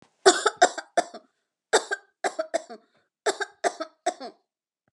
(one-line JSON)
{"three_cough_length": "4.9 s", "three_cough_amplitude": 28537, "three_cough_signal_mean_std_ratio": 0.31, "survey_phase": "beta (2021-08-13 to 2022-03-07)", "age": "45-64", "gender": "Female", "wearing_mask": "No", "symptom_none": true, "smoker_status": "Never smoked", "respiratory_condition_asthma": false, "respiratory_condition_other": false, "recruitment_source": "REACT", "submission_delay": "11 days", "covid_test_result": "Negative", "covid_test_method": "RT-qPCR"}